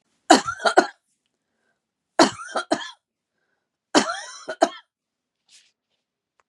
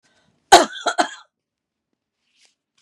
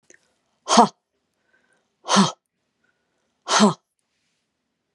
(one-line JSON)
{"three_cough_length": "6.5 s", "three_cough_amplitude": 32760, "three_cough_signal_mean_std_ratio": 0.26, "cough_length": "2.8 s", "cough_amplitude": 32768, "cough_signal_mean_std_ratio": 0.22, "exhalation_length": "4.9 s", "exhalation_amplitude": 29906, "exhalation_signal_mean_std_ratio": 0.27, "survey_phase": "beta (2021-08-13 to 2022-03-07)", "age": "45-64", "gender": "Female", "wearing_mask": "No", "symptom_shortness_of_breath": true, "smoker_status": "Never smoked", "respiratory_condition_asthma": true, "respiratory_condition_other": false, "recruitment_source": "REACT", "submission_delay": "2 days", "covid_test_result": "Negative", "covid_test_method": "RT-qPCR", "influenza_a_test_result": "Negative", "influenza_b_test_result": "Negative"}